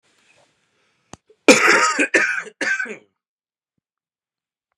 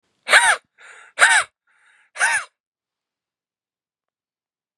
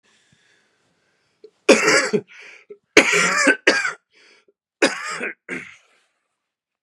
cough_length: 4.8 s
cough_amplitude: 32768
cough_signal_mean_std_ratio: 0.35
exhalation_length: 4.8 s
exhalation_amplitude: 32768
exhalation_signal_mean_std_ratio: 0.3
three_cough_length: 6.8 s
three_cough_amplitude: 32768
three_cough_signal_mean_std_ratio: 0.37
survey_phase: beta (2021-08-13 to 2022-03-07)
age: 18-44
gender: Male
wearing_mask: 'No'
symptom_cough_any: true
symptom_shortness_of_breath: true
symptom_sore_throat: true
symptom_fever_high_temperature: true
symptom_onset: 2 days
smoker_status: Never smoked
recruitment_source: Test and Trace
submission_delay: 1 day
covid_test_result: Positive
covid_test_method: RT-qPCR
covid_ct_value: 27.6
covid_ct_gene: ORF1ab gene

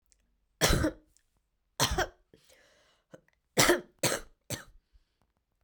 three_cough_length: 5.6 s
three_cough_amplitude: 15220
three_cough_signal_mean_std_ratio: 0.32
survey_phase: beta (2021-08-13 to 2022-03-07)
age: 18-44
gender: Female
wearing_mask: 'No'
symptom_cough_any: true
symptom_new_continuous_cough: true
symptom_sore_throat: true
symptom_abdominal_pain: true
symptom_diarrhoea: true
symptom_headache: true
symptom_change_to_sense_of_smell_or_taste: true
symptom_loss_of_taste: true
symptom_onset: 6 days
smoker_status: Ex-smoker
respiratory_condition_asthma: false
respiratory_condition_other: false
recruitment_source: Test and Trace
submission_delay: 3 days
covid_test_result: Positive
covid_test_method: ePCR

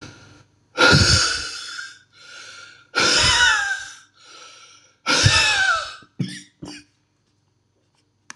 exhalation_length: 8.4 s
exhalation_amplitude: 25939
exhalation_signal_mean_std_ratio: 0.48
survey_phase: beta (2021-08-13 to 2022-03-07)
age: 45-64
gender: Male
wearing_mask: 'No'
symptom_cough_any: true
symptom_new_continuous_cough: true
symptom_runny_or_blocked_nose: true
symptom_shortness_of_breath: true
symptom_sore_throat: true
symptom_fatigue: true
symptom_headache: true
symptom_onset: 3 days
smoker_status: Ex-smoker
respiratory_condition_asthma: false
respiratory_condition_other: false
recruitment_source: Test and Trace
submission_delay: 1 day
covid_test_result: Positive
covid_test_method: RT-qPCR
covid_ct_value: 17.1
covid_ct_gene: N gene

